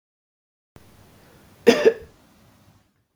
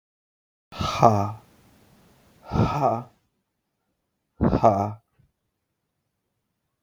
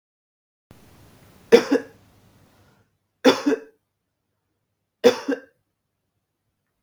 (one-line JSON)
{"cough_length": "3.2 s", "cough_amplitude": 32725, "cough_signal_mean_std_ratio": 0.22, "exhalation_length": "6.8 s", "exhalation_amplitude": 32766, "exhalation_signal_mean_std_ratio": 0.34, "three_cough_length": "6.8 s", "three_cough_amplitude": 32766, "three_cough_signal_mean_std_ratio": 0.23, "survey_phase": "beta (2021-08-13 to 2022-03-07)", "age": "18-44", "gender": "Male", "wearing_mask": "No", "symptom_runny_or_blocked_nose": true, "symptom_sore_throat": true, "symptom_headache": true, "smoker_status": "Never smoked", "respiratory_condition_asthma": false, "respiratory_condition_other": false, "recruitment_source": "Test and Trace", "submission_delay": "1 day", "covid_test_result": "Positive", "covid_test_method": "RT-qPCR", "covid_ct_value": 16.8, "covid_ct_gene": "ORF1ab gene", "covid_ct_mean": 17.2, "covid_viral_load": "2300000 copies/ml", "covid_viral_load_category": "High viral load (>1M copies/ml)"}